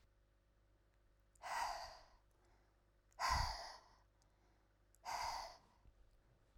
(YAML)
exhalation_length: 6.6 s
exhalation_amplitude: 1593
exhalation_signal_mean_std_ratio: 0.41
survey_phase: beta (2021-08-13 to 2022-03-07)
age: 18-44
gender: Female
wearing_mask: 'No'
symptom_none: true
smoker_status: Never smoked
respiratory_condition_asthma: false
respiratory_condition_other: false
recruitment_source: REACT
submission_delay: 0 days
covid_test_result: Negative
covid_test_method: RT-qPCR